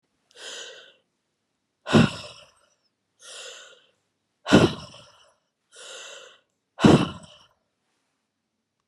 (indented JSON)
{
  "exhalation_length": "8.9 s",
  "exhalation_amplitude": 29922,
  "exhalation_signal_mean_std_ratio": 0.24,
  "survey_phase": "beta (2021-08-13 to 2022-03-07)",
  "age": "45-64",
  "gender": "Female",
  "wearing_mask": "No",
  "symptom_cough_any": true,
  "symptom_runny_or_blocked_nose": true,
  "symptom_sore_throat": true,
  "symptom_headache": true,
  "symptom_loss_of_taste": true,
  "symptom_other": true,
  "symptom_onset": "4 days",
  "smoker_status": "Ex-smoker",
  "respiratory_condition_asthma": false,
  "respiratory_condition_other": false,
  "recruitment_source": "Test and Trace",
  "submission_delay": "1 day",
  "covid_test_result": "Positive",
  "covid_test_method": "RT-qPCR",
  "covid_ct_value": 29.5,
  "covid_ct_gene": "N gene"
}